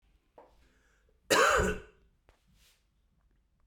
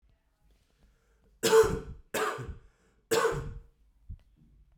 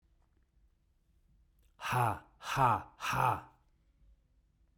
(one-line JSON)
{"cough_length": "3.7 s", "cough_amplitude": 8515, "cough_signal_mean_std_ratio": 0.3, "three_cough_length": "4.8 s", "three_cough_amplitude": 9376, "three_cough_signal_mean_std_ratio": 0.36, "exhalation_length": "4.8 s", "exhalation_amplitude": 5339, "exhalation_signal_mean_std_ratio": 0.38, "survey_phase": "beta (2021-08-13 to 2022-03-07)", "age": "18-44", "gender": "Male", "wearing_mask": "No", "symptom_cough_any": true, "symptom_runny_or_blocked_nose": true, "symptom_abdominal_pain": true, "symptom_fatigue": true, "symptom_headache": true, "symptom_change_to_sense_of_smell_or_taste": true, "symptom_loss_of_taste": true, "symptom_onset": "3 days", "smoker_status": "Ex-smoker", "respiratory_condition_asthma": false, "respiratory_condition_other": false, "recruitment_source": "Test and Trace", "submission_delay": "1 day", "covid_test_result": "Positive", "covid_test_method": "ePCR"}